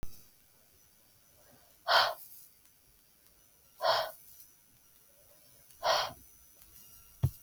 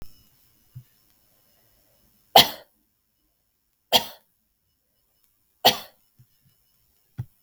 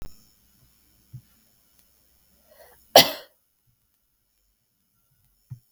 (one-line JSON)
{"exhalation_length": "7.4 s", "exhalation_amplitude": 8521, "exhalation_signal_mean_std_ratio": 0.33, "three_cough_length": "7.4 s", "three_cough_amplitude": 32768, "three_cough_signal_mean_std_ratio": 0.17, "cough_length": "5.7 s", "cough_amplitude": 32768, "cough_signal_mean_std_ratio": 0.13, "survey_phase": "beta (2021-08-13 to 2022-03-07)", "age": "18-44", "gender": "Female", "wearing_mask": "No", "symptom_cough_any": true, "symptom_sore_throat": true, "symptom_fatigue": true, "symptom_headache": true, "symptom_onset": "3 days", "smoker_status": "Never smoked", "respiratory_condition_asthma": false, "respiratory_condition_other": false, "recruitment_source": "Test and Trace", "submission_delay": "2 days", "covid_test_result": "Positive", "covid_test_method": "RT-qPCR", "covid_ct_value": 24.2, "covid_ct_gene": "N gene"}